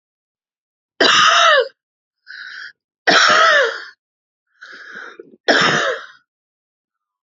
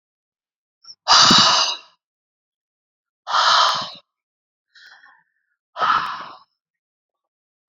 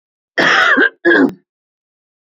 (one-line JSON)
{"three_cough_length": "7.3 s", "three_cough_amplitude": 32058, "three_cough_signal_mean_std_ratio": 0.45, "exhalation_length": "7.7 s", "exhalation_amplitude": 31525, "exhalation_signal_mean_std_ratio": 0.36, "cough_length": "2.2 s", "cough_amplitude": 29964, "cough_signal_mean_std_ratio": 0.53, "survey_phase": "beta (2021-08-13 to 2022-03-07)", "age": "18-44", "gender": "Female", "wearing_mask": "No", "symptom_none": true, "smoker_status": "Ex-smoker", "respiratory_condition_asthma": true, "respiratory_condition_other": false, "recruitment_source": "REACT", "submission_delay": "1 day", "covid_test_result": "Negative", "covid_test_method": "RT-qPCR", "influenza_a_test_result": "Negative", "influenza_b_test_result": "Negative"}